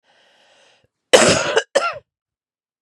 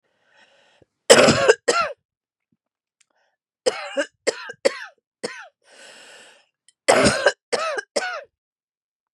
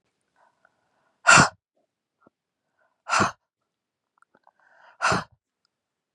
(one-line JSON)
{"cough_length": "2.8 s", "cough_amplitude": 32768, "cough_signal_mean_std_ratio": 0.35, "three_cough_length": "9.1 s", "three_cough_amplitude": 32768, "three_cough_signal_mean_std_ratio": 0.33, "exhalation_length": "6.1 s", "exhalation_amplitude": 25784, "exhalation_signal_mean_std_ratio": 0.23, "survey_phase": "beta (2021-08-13 to 2022-03-07)", "age": "18-44", "gender": "Female", "wearing_mask": "No", "symptom_cough_any": true, "symptom_new_continuous_cough": true, "symptom_runny_or_blocked_nose": true, "symptom_shortness_of_breath": true, "symptom_sore_throat": true, "symptom_fatigue": true, "symptom_fever_high_temperature": true, "symptom_headache": true, "smoker_status": "Never smoked", "respiratory_condition_asthma": false, "respiratory_condition_other": false, "recruitment_source": "Test and Trace", "submission_delay": "1 day", "covid_test_result": "Positive", "covid_test_method": "RT-qPCR", "covid_ct_value": 23.8, "covid_ct_gene": "N gene"}